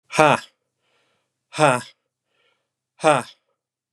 {
  "exhalation_length": "3.9 s",
  "exhalation_amplitude": 32767,
  "exhalation_signal_mean_std_ratio": 0.27,
  "survey_phase": "beta (2021-08-13 to 2022-03-07)",
  "age": "18-44",
  "gender": "Male",
  "wearing_mask": "No",
  "symptom_runny_or_blocked_nose": true,
  "smoker_status": "Never smoked",
  "respiratory_condition_asthma": false,
  "respiratory_condition_other": false,
  "recruitment_source": "REACT",
  "submission_delay": "1 day",
  "covid_test_result": "Negative",
  "covid_test_method": "RT-qPCR",
  "influenza_a_test_result": "Negative",
  "influenza_b_test_result": "Negative"
}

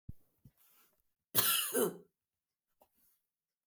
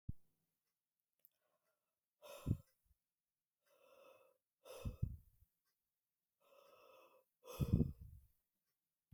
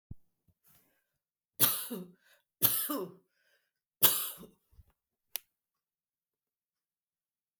{
  "cough_length": "3.7 s",
  "cough_amplitude": 6511,
  "cough_signal_mean_std_ratio": 0.32,
  "exhalation_length": "9.1 s",
  "exhalation_amplitude": 2585,
  "exhalation_signal_mean_std_ratio": 0.23,
  "three_cough_length": "7.6 s",
  "three_cough_amplitude": 9564,
  "three_cough_signal_mean_std_ratio": 0.26,
  "survey_phase": "beta (2021-08-13 to 2022-03-07)",
  "age": "45-64",
  "gender": "Female",
  "wearing_mask": "No",
  "symptom_none": true,
  "smoker_status": "Never smoked",
  "respiratory_condition_asthma": false,
  "respiratory_condition_other": false,
  "recruitment_source": "REACT",
  "submission_delay": "5 days",
  "covid_test_result": "Negative",
  "covid_test_method": "RT-qPCR",
  "influenza_a_test_result": "Negative",
  "influenza_b_test_result": "Negative"
}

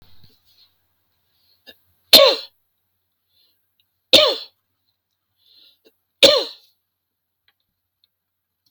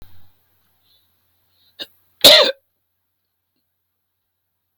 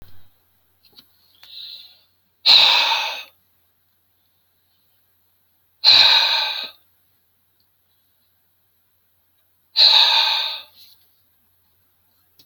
{
  "three_cough_length": "8.7 s",
  "three_cough_amplitude": 32768,
  "three_cough_signal_mean_std_ratio": 0.22,
  "cough_length": "4.8 s",
  "cough_amplitude": 32768,
  "cough_signal_mean_std_ratio": 0.2,
  "exhalation_length": "12.5 s",
  "exhalation_amplitude": 32767,
  "exhalation_signal_mean_std_ratio": 0.34,
  "survey_phase": "beta (2021-08-13 to 2022-03-07)",
  "age": "45-64",
  "gender": "Male",
  "wearing_mask": "No",
  "symptom_none": true,
  "smoker_status": "Never smoked",
  "respiratory_condition_asthma": false,
  "respiratory_condition_other": false,
  "recruitment_source": "REACT",
  "submission_delay": "1 day",
  "covid_test_result": "Negative",
  "covid_test_method": "RT-qPCR"
}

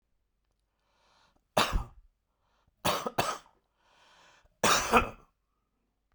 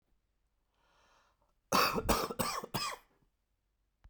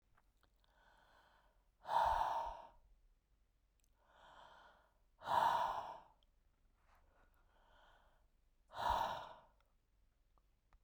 {
  "three_cough_length": "6.1 s",
  "three_cough_amplitude": 14246,
  "three_cough_signal_mean_std_ratio": 0.31,
  "cough_length": "4.1 s",
  "cough_amplitude": 6861,
  "cough_signal_mean_std_ratio": 0.38,
  "exhalation_length": "10.8 s",
  "exhalation_amplitude": 2316,
  "exhalation_signal_mean_std_ratio": 0.35,
  "survey_phase": "beta (2021-08-13 to 2022-03-07)",
  "age": "45-64",
  "gender": "Male",
  "wearing_mask": "No",
  "symptom_cough_any": true,
  "symptom_new_continuous_cough": true,
  "symptom_sore_throat": true,
  "symptom_fatigue": true,
  "symptom_headache": true,
  "symptom_onset": "6 days",
  "smoker_status": "Never smoked",
  "respiratory_condition_asthma": false,
  "respiratory_condition_other": false,
  "recruitment_source": "Test and Trace",
  "submission_delay": "2 days",
  "covid_test_result": "Positive",
  "covid_test_method": "RT-qPCR",
  "covid_ct_value": 16.3,
  "covid_ct_gene": "ORF1ab gene",
  "covid_ct_mean": 17.2,
  "covid_viral_load": "2300000 copies/ml",
  "covid_viral_load_category": "High viral load (>1M copies/ml)"
}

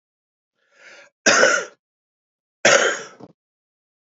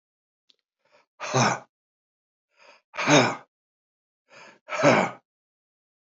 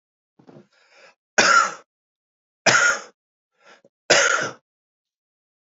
{
  "cough_length": "4.0 s",
  "cough_amplitude": 31819,
  "cough_signal_mean_std_ratio": 0.33,
  "exhalation_length": "6.1 s",
  "exhalation_amplitude": 20676,
  "exhalation_signal_mean_std_ratio": 0.31,
  "three_cough_length": "5.7 s",
  "three_cough_amplitude": 28738,
  "three_cough_signal_mean_std_ratio": 0.34,
  "survey_phase": "beta (2021-08-13 to 2022-03-07)",
  "age": "65+",
  "gender": "Male",
  "wearing_mask": "No",
  "symptom_cough_any": true,
  "symptom_runny_or_blocked_nose": true,
  "symptom_abdominal_pain": true,
  "symptom_fatigue": true,
  "symptom_fever_high_temperature": true,
  "symptom_headache": true,
  "smoker_status": "Ex-smoker",
  "respiratory_condition_asthma": false,
  "respiratory_condition_other": false,
  "recruitment_source": "Test and Trace",
  "submission_delay": "1 day",
  "covid_test_result": "Positive",
  "covid_test_method": "ePCR"
}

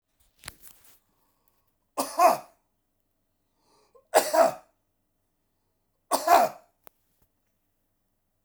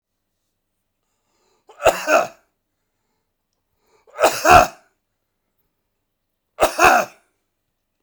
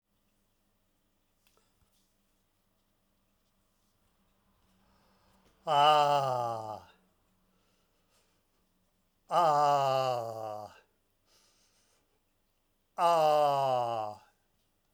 {
  "three_cough_length": "8.4 s",
  "three_cough_amplitude": 19995,
  "three_cough_signal_mean_std_ratio": 0.26,
  "cough_length": "8.0 s",
  "cough_amplitude": 32768,
  "cough_signal_mean_std_ratio": 0.28,
  "exhalation_length": "14.9 s",
  "exhalation_amplitude": 7949,
  "exhalation_signal_mean_std_ratio": 0.37,
  "survey_phase": "beta (2021-08-13 to 2022-03-07)",
  "age": "65+",
  "gender": "Male",
  "wearing_mask": "No",
  "symptom_fatigue": true,
  "smoker_status": "Never smoked",
  "respiratory_condition_asthma": false,
  "respiratory_condition_other": false,
  "recruitment_source": "REACT",
  "submission_delay": "1 day",
  "covid_test_result": "Negative",
  "covid_test_method": "RT-qPCR"
}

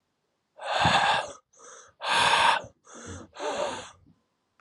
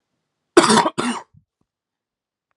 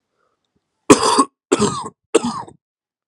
{
  "exhalation_length": "4.6 s",
  "exhalation_amplitude": 12603,
  "exhalation_signal_mean_std_ratio": 0.51,
  "cough_length": "2.6 s",
  "cough_amplitude": 32767,
  "cough_signal_mean_std_ratio": 0.31,
  "three_cough_length": "3.1 s",
  "three_cough_amplitude": 32768,
  "three_cough_signal_mean_std_ratio": 0.36,
  "survey_phase": "alpha (2021-03-01 to 2021-08-12)",
  "age": "18-44",
  "gender": "Male",
  "wearing_mask": "No",
  "symptom_cough_any": true,
  "symptom_abdominal_pain": true,
  "smoker_status": "Current smoker (1 to 10 cigarettes per day)",
  "respiratory_condition_asthma": false,
  "respiratory_condition_other": false,
  "recruitment_source": "Test and Trace",
  "submission_delay": "2 days",
  "covid_test_result": "Positive",
  "covid_test_method": "RT-qPCR",
  "covid_ct_value": 22.2,
  "covid_ct_gene": "N gene",
  "covid_ct_mean": 22.4,
  "covid_viral_load": "44000 copies/ml",
  "covid_viral_load_category": "Low viral load (10K-1M copies/ml)"
}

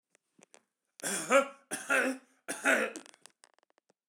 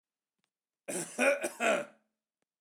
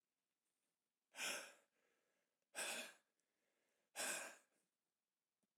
{
  "three_cough_length": "4.1 s",
  "three_cough_amplitude": 10233,
  "three_cough_signal_mean_std_ratio": 0.39,
  "cough_length": "2.6 s",
  "cough_amplitude": 6729,
  "cough_signal_mean_std_ratio": 0.41,
  "exhalation_length": "5.6 s",
  "exhalation_amplitude": 751,
  "exhalation_signal_mean_std_ratio": 0.35,
  "survey_phase": "alpha (2021-03-01 to 2021-08-12)",
  "age": "65+",
  "gender": "Male",
  "wearing_mask": "No",
  "symptom_none": true,
  "smoker_status": "Ex-smoker",
  "respiratory_condition_asthma": false,
  "respiratory_condition_other": false,
  "recruitment_source": "REACT",
  "submission_delay": "1 day",
  "covid_test_result": "Negative",
  "covid_test_method": "RT-qPCR"
}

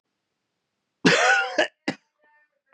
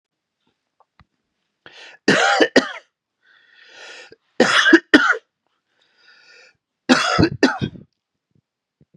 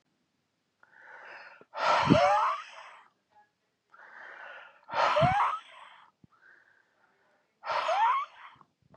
{
  "cough_length": "2.7 s",
  "cough_amplitude": 20852,
  "cough_signal_mean_std_ratio": 0.38,
  "three_cough_length": "9.0 s",
  "three_cough_amplitude": 32768,
  "three_cough_signal_mean_std_ratio": 0.34,
  "exhalation_length": "9.0 s",
  "exhalation_amplitude": 15370,
  "exhalation_signal_mean_std_ratio": 0.43,
  "survey_phase": "beta (2021-08-13 to 2022-03-07)",
  "age": "18-44",
  "gender": "Male",
  "wearing_mask": "No",
  "symptom_cough_any": true,
  "symptom_new_continuous_cough": true,
  "symptom_runny_or_blocked_nose": true,
  "symptom_shortness_of_breath": true,
  "symptom_sore_throat": true,
  "symptom_fatigue": true,
  "symptom_fever_high_temperature": true,
  "symptom_headache": true,
  "symptom_change_to_sense_of_smell_or_taste": true,
  "symptom_onset": "2 days",
  "smoker_status": "Ex-smoker",
  "respiratory_condition_asthma": false,
  "respiratory_condition_other": false,
  "recruitment_source": "Test and Trace",
  "submission_delay": "2 days",
  "covid_test_result": "Positive",
  "covid_test_method": "RT-qPCR",
  "covid_ct_value": 23.5,
  "covid_ct_gene": "ORF1ab gene"
}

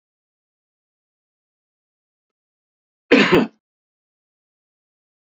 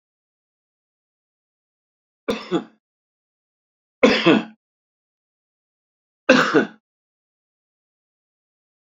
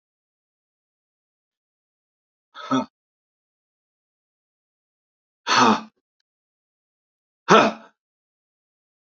{
  "cough_length": "5.2 s",
  "cough_amplitude": 29915,
  "cough_signal_mean_std_ratio": 0.19,
  "three_cough_length": "9.0 s",
  "three_cough_amplitude": 31589,
  "three_cough_signal_mean_std_ratio": 0.24,
  "exhalation_length": "9.0 s",
  "exhalation_amplitude": 28864,
  "exhalation_signal_mean_std_ratio": 0.21,
  "survey_phase": "beta (2021-08-13 to 2022-03-07)",
  "age": "65+",
  "gender": "Male",
  "wearing_mask": "No",
  "symptom_none": true,
  "smoker_status": "Ex-smoker",
  "respiratory_condition_asthma": false,
  "respiratory_condition_other": true,
  "recruitment_source": "REACT",
  "submission_delay": "2 days",
  "covid_test_result": "Negative",
  "covid_test_method": "RT-qPCR",
  "influenza_a_test_result": "Negative",
  "influenza_b_test_result": "Negative"
}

